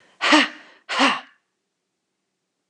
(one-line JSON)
{"exhalation_length": "2.7 s", "exhalation_amplitude": 28356, "exhalation_signal_mean_std_ratio": 0.35, "survey_phase": "beta (2021-08-13 to 2022-03-07)", "age": "45-64", "gender": "Female", "wearing_mask": "No", "symptom_none": true, "smoker_status": "Ex-smoker", "respiratory_condition_asthma": false, "respiratory_condition_other": false, "recruitment_source": "REACT", "submission_delay": "2 days", "covid_test_result": "Negative", "covid_test_method": "RT-qPCR", "influenza_a_test_result": "Negative", "influenza_b_test_result": "Negative"}